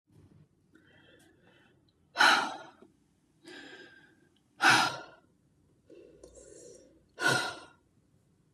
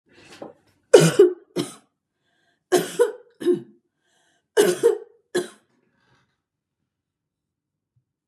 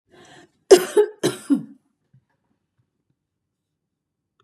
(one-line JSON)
{"exhalation_length": "8.5 s", "exhalation_amplitude": 9885, "exhalation_signal_mean_std_ratio": 0.29, "three_cough_length": "8.3 s", "three_cough_amplitude": 32768, "three_cough_signal_mean_std_ratio": 0.29, "cough_length": "4.4 s", "cough_amplitude": 32746, "cough_signal_mean_std_ratio": 0.23, "survey_phase": "beta (2021-08-13 to 2022-03-07)", "age": "45-64", "gender": "Female", "wearing_mask": "No", "symptom_none": true, "smoker_status": "Ex-smoker", "respiratory_condition_asthma": false, "respiratory_condition_other": false, "recruitment_source": "REACT", "submission_delay": "2 days", "covid_test_result": "Negative", "covid_test_method": "RT-qPCR", "influenza_a_test_result": "Negative", "influenza_b_test_result": "Negative"}